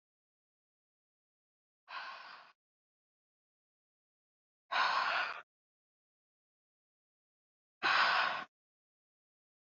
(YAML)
exhalation_length: 9.6 s
exhalation_amplitude: 3952
exhalation_signal_mean_std_ratio: 0.3
survey_phase: beta (2021-08-13 to 2022-03-07)
age: 18-44
gender: Female
wearing_mask: 'No'
symptom_cough_any: true
symptom_runny_or_blocked_nose: true
symptom_fatigue: true
symptom_fever_high_temperature: true
symptom_headache: true
symptom_change_to_sense_of_smell_or_taste: true
symptom_other: true
smoker_status: Never smoked
respiratory_condition_asthma: false
respiratory_condition_other: false
recruitment_source: Test and Trace
submission_delay: 2 days
covid_test_result: Positive
covid_test_method: RT-qPCR
covid_ct_value: 16.3
covid_ct_gene: ORF1ab gene
covid_ct_mean: 16.7
covid_viral_load: 3400000 copies/ml
covid_viral_load_category: High viral load (>1M copies/ml)